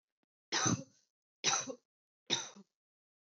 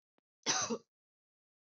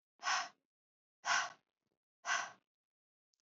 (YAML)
three_cough_length: 3.2 s
three_cough_amplitude: 4512
three_cough_signal_mean_std_ratio: 0.36
cough_length: 1.6 s
cough_amplitude: 4660
cough_signal_mean_std_ratio: 0.34
exhalation_length: 3.4 s
exhalation_amplitude: 3513
exhalation_signal_mean_std_ratio: 0.35
survey_phase: beta (2021-08-13 to 2022-03-07)
age: 18-44
gender: Female
wearing_mask: 'No'
symptom_runny_or_blocked_nose: true
symptom_sore_throat: true
symptom_onset: 5 days
smoker_status: Never smoked
respiratory_condition_asthma: false
respiratory_condition_other: false
recruitment_source: Test and Trace
submission_delay: 2 days
covid_test_result: Positive
covid_test_method: ePCR